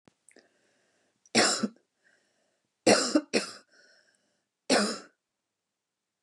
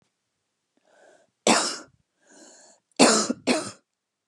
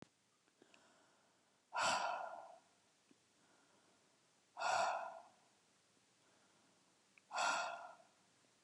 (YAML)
three_cough_length: 6.2 s
three_cough_amplitude: 15161
three_cough_signal_mean_std_ratio: 0.3
cough_length: 4.3 s
cough_amplitude: 27276
cough_signal_mean_std_ratio: 0.32
exhalation_length: 8.6 s
exhalation_amplitude: 1770
exhalation_signal_mean_std_ratio: 0.38
survey_phase: beta (2021-08-13 to 2022-03-07)
age: 45-64
gender: Female
wearing_mask: 'No'
symptom_sore_throat: true
symptom_fatigue: true
symptom_headache: true
smoker_status: Ex-smoker
respiratory_condition_asthma: false
respiratory_condition_other: false
recruitment_source: Test and Trace
submission_delay: 1 day
covid_test_result: Positive
covid_test_method: ePCR